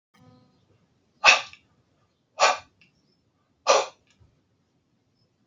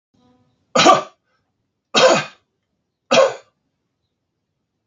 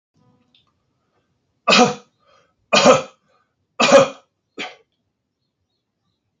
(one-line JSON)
{"exhalation_length": "5.5 s", "exhalation_amplitude": 28030, "exhalation_signal_mean_std_ratio": 0.23, "cough_length": "4.9 s", "cough_amplitude": 32670, "cough_signal_mean_std_ratio": 0.32, "three_cough_length": "6.4 s", "three_cough_amplitude": 30695, "three_cough_signal_mean_std_ratio": 0.29, "survey_phase": "alpha (2021-03-01 to 2021-08-12)", "age": "65+", "gender": "Male", "wearing_mask": "No", "symptom_fatigue": true, "smoker_status": "Ex-smoker", "respiratory_condition_asthma": false, "respiratory_condition_other": false, "recruitment_source": "REACT", "submission_delay": "3 days", "covid_test_result": "Negative", "covid_test_method": "RT-qPCR"}